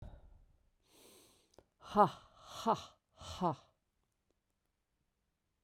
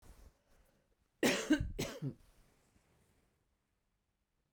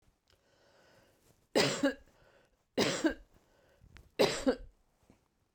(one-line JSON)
{"exhalation_length": "5.6 s", "exhalation_amplitude": 6345, "exhalation_signal_mean_std_ratio": 0.24, "cough_length": "4.5 s", "cough_amplitude": 4210, "cough_signal_mean_std_ratio": 0.3, "three_cough_length": "5.5 s", "three_cough_amplitude": 6822, "three_cough_signal_mean_std_ratio": 0.34, "survey_phase": "beta (2021-08-13 to 2022-03-07)", "age": "45-64", "gender": "Female", "wearing_mask": "No", "symptom_cough_any": true, "symptom_runny_or_blocked_nose": true, "symptom_fatigue": true, "symptom_headache": true, "symptom_change_to_sense_of_smell_or_taste": true, "symptom_onset": "5 days", "smoker_status": "Never smoked", "respiratory_condition_asthma": false, "respiratory_condition_other": false, "recruitment_source": "Test and Trace", "submission_delay": "2 days", "covid_test_result": "Positive", "covid_test_method": "RT-qPCR", "covid_ct_value": 16.4, "covid_ct_gene": "ORF1ab gene"}